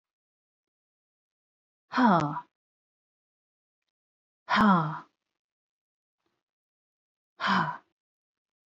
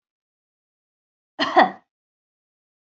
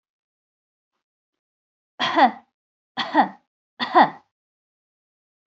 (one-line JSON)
{"exhalation_length": "8.7 s", "exhalation_amplitude": 12488, "exhalation_signal_mean_std_ratio": 0.28, "cough_length": "3.0 s", "cough_amplitude": 24511, "cough_signal_mean_std_ratio": 0.21, "three_cough_length": "5.5 s", "three_cough_amplitude": 24939, "three_cough_signal_mean_std_ratio": 0.27, "survey_phase": "beta (2021-08-13 to 2022-03-07)", "age": "45-64", "gender": "Female", "wearing_mask": "No", "symptom_none": true, "smoker_status": "Never smoked", "respiratory_condition_asthma": false, "respiratory_condition_other": false, "recruitment_source": "REACT", "submission_delay": "1 day", "covid_test_result": "Negative", "covid_test_method": "RT-qPCR"}